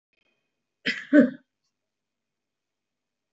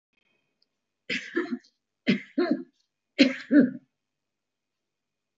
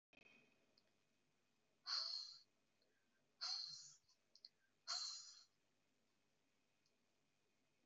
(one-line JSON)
{"cough_length": "3.3 s", "cough_amplitude": 20133, "cough_signal_mean_std_ratio": 0.21, "three_cough_length": "5.4 s", "three_cough_amplitude": 17091, "three_cough_signal_mean_std_ratio": 0.31, "exhalation_length": "7.9 s", "exhalation_amplitude": 725, "exhalation_signal_mean_std_ratio": 0.35, "survey_phase": "beta (2021-08-13 to 2022-03-07)", "age": "65+", "gender": "Female", "wearing_mask": "No", "symptom_none": true, "smoker_status": "Ex-smoker", "respiratory_condition_asthma": false, "respiratory_condition_other": false, "recruitment_source": "REACT", "submission_delay": "2 days", "covid_test_result": "Negative", "covid_test_method": "RT-qPCR", "influenza_a_test_result": "Negative", "influenza_b_test_result": "Negative"}